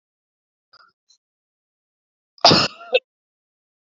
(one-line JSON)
{"cough_length": "3.9 s", "cough_amplitude": 30008, "cough_signal_mean_std_ratio": 0.21, "survey_phase": "alpha (2021-03-01 to 2021-08-12)", "age": "18-44", "gender": "Male", "wearing_mask": "No", "symptom_cough_any": true, "symptom_fatigue": true, "symptom_fever_high_temperature": true, "symptom_headache": true, "symptom_onset": "2 days", "smoker_status": "Never smoked", "respiratory_condition_asthma": true, "respiratory_condition_other": false, "recruitment_source": "Test and Trace", "submission_delay": "1 day", "covid_test_result": "Positive", "covid_test_method": "RT-qPCR"}